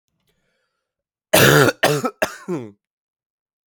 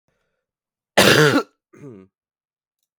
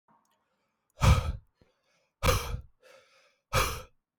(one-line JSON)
{"three_cough_length": "3.7 s", "three_cough_amplitude": 32768, "three_cough_signal_mean_std_ratio": 0.35, "cough_length": "3.0 s", "cough_amplitude": 32766, "cough_signal_mean_std_ratio": 0.31, "exhalation_length": "4.2 s", "exhalation_amplitude": 11112, "exhalation_signal_mean_std_ratio": 0.34, "survey_phase": "beta (2021-08-13 to 2022-03-07)", "age": "18-44", "gender": "Male", "wearing_mask": "No", "symptom_new_continuous_cough": true, "symptom_runny_or_blocked_nose": true, "symptom_sore_throat": true, "symptom_onset": "5 days", "smoker_status": "Never smoked", "respiratory_condition_asthma": false, "respiratory_condition_other": false, "recruitment_source": "REACT", "submission_delay": "0 days", "covid_test_result": "Negative", "covid_test_method": "RT-qPCR"}